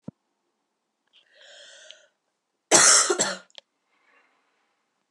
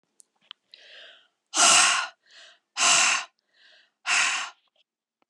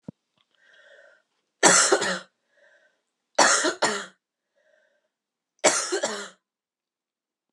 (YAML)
cough_length: 5.1 s
cough_amplitude: 27131
cough_signal_mean_std_ratio: 0.26
exhalation_length: 5.3 s
exhalation_amplitude: 18664
exhalation_signal_mean_std_ratio: 0.41
three_cough_length: 7.5 s
three_cough_amplitude: 27941
three_cough_signal_mean_std_ratio: 0.34
survey_phase: alpha (2021-03-01 to 2021-08-12)
age: 18-44
gender: Female
wearing_mask: 'No'
symptom_cough_any: true
symptom_new_continuous_cough: true
symptom_fatigue: true
symptom_change_to_sense_of_smell_or_taste: true
symptom_loss_of_taste: true
symptom_onset: 3 days
smoker_status: Ex-smoker
respiratory_condition_asthma: false
respiratory_condition_other: false
recruitment_source: Test and Trace
submission_delay: 2 days
covid_test_result: Positive
covid_test_method: RT-qPCR
covid_ct_value: 14.9
covid_ct_gene: ORF1ab gene
covid_ct_mean: 15.2
covid_viral_load: 11000000 copies/ml
covid_viral_load_category: High viral load (>1M copies/ml)